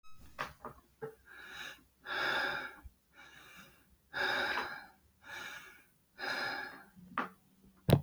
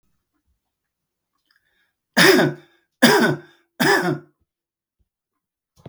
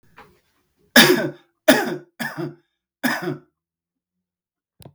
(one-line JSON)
{"exhalation_length": "8.0 s", "exhalation_amplitude": 8390, "exhalation_signal_mean_std_ratio": 0.46, "three_cough_length": "5.9 s", "three_cough_amplitude": 32768, "three_cough_signal_mean_std_ratio": 0.34, "cough_length": "4.9 s", "cough_amplitude": 32768, "cough_signal_mean_std_ratio": 0.31, "survey_phase": "beta (2021-08-13 to 2022-03-07)", "age": "45-64", "gender": "Male", "wearing_mask": "No", "symptom_none": true, "smoker_status": "Ex-smoker", "respiratory_condition_asthma": false, "respiratory_condition_other": true, "recruitment_source": "REACT", "submission_delay": "1 day", "covid_test_result": "Negative", "covid_test_method": "RT-qPCR"}